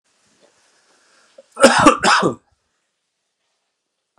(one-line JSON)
{"cough_length": "4.2 s", "cough_amplitude": 32768, "cough_signal_mean_std_ratio": 0.3, "survey_phase": "beta (2021-08-13 to 2022-03-07)", "age": "45-64", "gender": "Male", "wearing_mask": "No", "symptom_none": true, "smoker_status": "Ex-smoker", "respiratory_condition_asthma": false, "respiratory_condition_other": false, "recruitment_source": "REACT", "submission_delay": "1 day", "covid_test_result": "Negative", "covid_test_method": "RT-qPCR", "influenza_a_test_result": "Unknown/Void", "influenza_b_test_result": "Unknown/Void"}